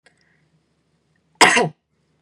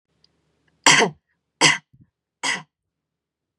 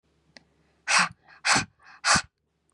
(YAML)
cough_length: 2.2 s
cough_amplitude: 32768
cough_signal_mean_std_ratio: 0.27
three_cough_length: 3.6 s
three_cough_amplitude: 32768
three_cough_signal_mean_std_ratio: 0.29
exhalation_length: 2.7 s
exhalation_amplitude: 16199
exhalation_signal_mean_std_ratio: 0.37
survey_phase: beta (2021-08-13 to 2022-03-07)
age: 18-44
gender: Female
wearing_mask: 'No'
symptom_none: true
smoker_status: Ex-smoker
respiratory_condition_asthma: false
respiratory_condition_other: false
recruitment_source: REACT
submission_delay: 2 days
covid_test_result: Negative
covid_test_method: RT-qPCR
influenza_a_test_result: Negative
influenza_b_test_result: Negative